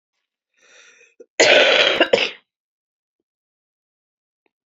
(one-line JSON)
{"cough_length": "4.7 s", "cough_amplitude": 30078, "cough_signal_mean_std_ratio": 0.33, "survey_phase": "beta (2021-08-13 to 2022-03-07)", "age": "45-64", "gender": "Female", "wearing_mask": "No", "symptom_cough_any": true, "symptom_new_continuous_cough": true, "symptom_runny_or_blocked_nose": true, "symptom_sore_throat": true, "symptom_headache": true, "symptom_change_to_sense_of_smell_or_taste": true, "symptom_loss_of_taste": true, "symptom_onset": "4 days", "smoker_status": "Never smoked", "respiratory_condition_asthma": false, "respiratory_condition_other": false, "recruitment_source": "Test and Trace", "submission_delay": "2 days", "covid_test_result": "Positive", "covid_test_method": "RT-qPCR"}